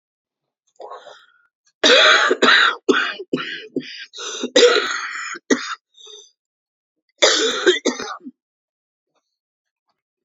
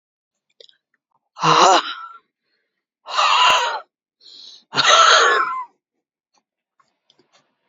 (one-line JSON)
{"cough_length": "10.2 s", "cough_amplitude": 32208, "cough_signal_mean_std_ratio": 0.42, "exhalation_length": "7.7 s", "exhalation_amplitude": 31530, "exhalation_signal_mean_std_ratio": 0.41, "survey_phase": "beta (2021-08-13 to 2022-03-07)", "age": "45-64", "gender": "Female", "wearing_mask": "No", "symptom_cough_any": true, "symptom_runny_or_blocked_nose": true, "symptom_shortness_of_breath": true, "symptom_sore_throat": true, "symptom_fatigue": true, "symptom_onset": "12 days", "smoker_status": "Never smoked", "respiratory_condition_asthma": false, "respiratory_condition_other": false, "recruitment_source": "REACT", "submission_delay": "2 days", "covid_test_result": "Negative", "covid_test_method": "RT-qPCR"}